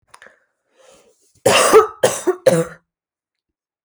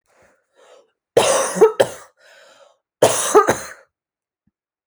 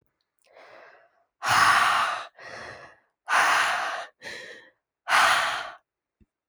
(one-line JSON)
{"three_cough_length": "3.8 s", "three_cough_amplitude": 30960, "three_cough_signal_mean_std_ratio": 0.36, "cough_length": "4.9 s", "cough_amplitude": 32768, "cough_signal_mean_std_ratio": 0.36, "exhalation_length": "6.5 s", "exhalation_amplitude": 14068, "exhalation_signal_mean_std_ratio": 0.49, "survey_phase": "beta (2021-08-13 to 2022-03-07)", "age": "18-44", "gender": "Female", "wearing_mask": "No", "symptom_none": true, "smoker_status": "Never smoked", "respiratory_condition_asthma": false, "respiratory_condition_other": false, "recruitment_source": "REACT", "submission_delay": "3 days", "covid_test_result": "Negative", "covid_test_method": "RT-qPCR"}